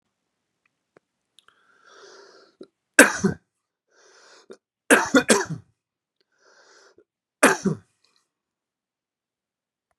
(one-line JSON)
{"three_cough_length": "10.0 s", "three_cough_amplitude": 32768, "three_cough_signal_mean_std_ratio": 0.22, "survey_phase": "beta (2021-08-13 to 2022-03-07)", "age": "45-64", "gender": "Male", "wearing_mask": "No", "symptom_cough_any": true, "symptom_abdominal_pain": true, "symptom_fatigue": true, "symptom_fever_high_temperature": true, "symptom_headache": true, "symptom_onset": "3 days", "smoker_status": "Never smoked", "respiratory_condition_asthma": true, "respiratory_condition_other": false, "recruitment_source": "Test and Trace", "submission_delay": "2 days", "covid_test_result": "Positive", "covid_test_method": "RT-qPCR", "covid_ct_value": 16.3, "covid_ct_gene": "ORF1ab gene", "covid_ct_mean": 17.8, "covid_viral_load": "1400000 copies/ml", "covid_viral_load_category": "High viral load (>1M copies/ml)"}